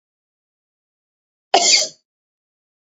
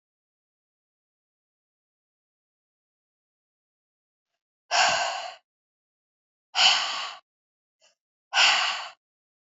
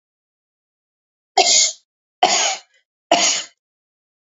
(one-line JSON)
{"cough_length": "3.0 s", "cough_amplitude": 32767, "cough_signal_mean_std_ratio": 0.25, "exhalation_length": "9.6 s", "exhalation_amplitude": 16975, "exhalation_signal_mean_std_ratio": 0.3, "three_cough_length": "4.3 s", "three_cough_amplitude": 28281, "three_cough_signal_mean_std_ratio": 0.38, "survey_phase": "beta (2021-08-13 to 2022-03-07)", "age": "45-64", "gender": "Female", "wearing_mask": "No", "symptom_fatigue": true, "smoker_status": "Never smoked", "respiratory_condition_asthma": false, "respiratory_condition_other": false, "recruitment_source": "REACT", "submission_delay": "5 days", "covid_test_result": "Negative", "covid_test_method": "RT-qPCR", "influenza_a_test_result": "Negative", "influenza_b_test_result": "Negative"}